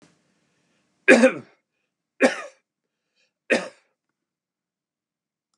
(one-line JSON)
{"three_cough_length": "5.6 s", "three_cough_amplitude": 32027, "three_cough_signal_mean_std_ratio": 0.22, "survey_phase": "beta (2021-08-13 to 2022-03-07)", "age": "65+", "gender": "Male", "wearing_mask": "No", "symptom_cough_any": true, "smoker_status": "Ex-smoker", "respiratory_condition_asthma": false, "respiratory_condition_other": false, "recruitment_source": "REACT", "submission_delay": "2 days", "covid_test_result": "Negative", "covid_test_method": "RT-qPCR", "influenza_a_test_result": "Negative", "influenza_b_test_result": "Negative"}